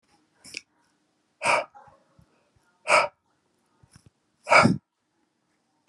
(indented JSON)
{
  "exhalation_length": "5.9 s",
  "exhalation_amplitude": 21312,
  "exhalation_signal_mean_std_ratio": 0.26,
  "survey_phase": "beta (2021-08-13 to 2022-03-07)",
  "age": "65+",
  "gender": "Male",
  "wearing_mask": "No",
  "symptom_none": true,
  "smoker_status": "Never smoked",
  "respiratory_condition_asthma": false,
  "respiratory_condition_other": false,
  "recruitment_source": "REACT",
  "submission_delay": "2 days",
  "covid_test_result": "Negative",
  "covid_test_method": "RT-qPCR"
}